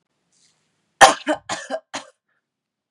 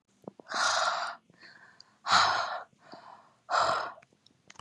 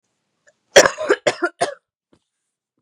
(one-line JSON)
{"three_cough_length": "2.9 s", "three_cough_amplitude": 32768, "three_cough_signal_mean_std_ratio": 0.23, "exhalation_length": "4.6 s", "exhalation_amplitude": 10747, "exhalation_signal_mean_std_ratio": 0.49, "cough_length": "2.8 s", "cough_amplitude": 32768, "cough_signal_mean_std_ratio": 0.28, "survey_phase": "beta (2021-08-13 to 2022-03-07)", "age": "18-44", "gender": "Female", "wearing_mask": "No", "symptom_cough_any": true, "symptom_fatigue": true, "symptom_headache": true, "symptom_onset": "12 days", "smoker_status": "Ex-smoker", "respiratory_condition_asthma": false, "respiratory_condition_other": false, "recruitment_source": "REACT", "submission_delay": "2 days", "covid_test_result": "Negative", "covid_test_method": "RT-qPCR", "influenza_a_test_result": "Negative", "influenza_b_test_result": "Negative"}